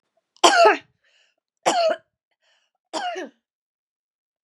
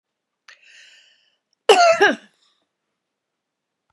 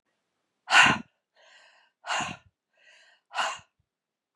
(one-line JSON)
{"three_cough_length": "4.4 s", "three_cough_amplitude": 32252, "three_cough_signal_mean_std_ratio": 0.33, "cough_length": "3.9 s", "cough_amplitude": 32083, "cough_signal_mean_std_ratio": 0.27, "exhalation_length": "4.4 s", "exhalation_amplitude": 21858, "exhalation_signal_mean_std_ratio": 0.27, "survey_phase": "beta (2021-08-13 to 2022-03-07)", "age": "65+", "gender": "Female", "wearing_mask": "No", "symptom_runny_or_blocked_nose": true, "symptom_other": true, "symptom_onset": "12 days", "smoker_status": "Never smoked", "respiratory_condition_asthma": false, "respiratory_condition_other": false, "recruitment_source": "REACT", "submission_delay": "2 days", "covid_test_result": "Negative", "covid_test_method": "RT-qPCR", "influenza_a_test_result": "Unknown/Void", "influenza_b_test_result": "Unknown/Void"}